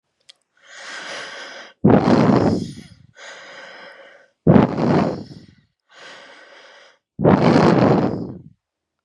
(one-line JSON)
{"exhalation_length": "9.0 s", "exhalation_amplitude": 32768, "exhalation_signal_mean_std_ratio": 0.46, "survey_phase": "beta (2021-08-13 to 2022-03-07)", "age": "18-44", "gender": "Female", "wearing_mask": "No", "symptom_none": true, "smoker_status": "Current smoker (1 to 10 cigarettes per day)", "respiratory_condition_asthma": true, "respiratory_condition_other": false, "recruitment_source": "Test and Trace", "submission_delay": "2 days", "covid_test_result": "Negative", "covid_test_method": "RT-qPCR"}